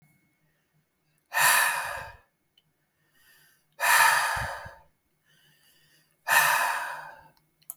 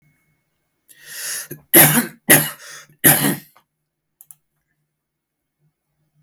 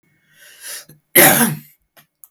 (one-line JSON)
{"exhalation_length": "7.8 s", "exhalation_amplitude": 17217, "exhalation_signal_mean_std_ratio": 0.41, "three_cough_length": "6.2 s", "three_cough_amplitude": 32768, "three_cough_signal_mean_std_ratio": 0.3, "cough_length": "2.3 s", "cough_amplitude": 32768, "cough_signal_mean_std_ratio": 0.35, "survey_phase": "beta (2021-08-13 to 2022-03-07)", "age": "18-44", "gender": "Male", "wearing_mask": "No", "symptom_none": true, "symptom_onset": "8 days", "smoker_status": "Never smoked", "respiratory_condition_asthma": false, "respiratory_condition_other": false, "recruitment_source": "REACT", "submission_delay": "1 day", "covid_test_result": "Negative", "covid_test_method": "RT-qPCR", "influenza_a_test_result": "Negative", "influenza_b_test_result": "Negative"}